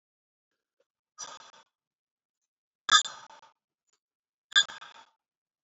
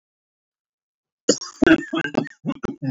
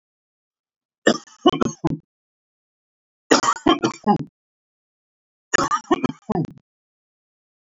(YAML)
exhalation_length: 5.6 s
exhalation_amplitude: 17906
exhalation_signal_mean_std_ratio: 0.17
cough_length: 2.9 s
cough_amplitude: 26243
cough_signal_mean_std_ratio: 0.34
three_cough_length: 7.7 s
three_cough_amplitude: 31498
three_cough_signal_mean_std_ratio: 0.31
survey_phase: beta (2021-08-13 to 2022-03-07)
age: 45-64
gender: Male
wearing_mask: 'No'
symptom_cough_any: true
symptom_runny_or_blocked_nose: true
symptom_fatigue: true
smoker_status: Never smoked
respiratory_condition_asthma: false
respiratory_condition_other: false
recruitment_source: Test and Trace
submission_delay: 2 days
covid_test_result: Positive
covid_test_method: LFT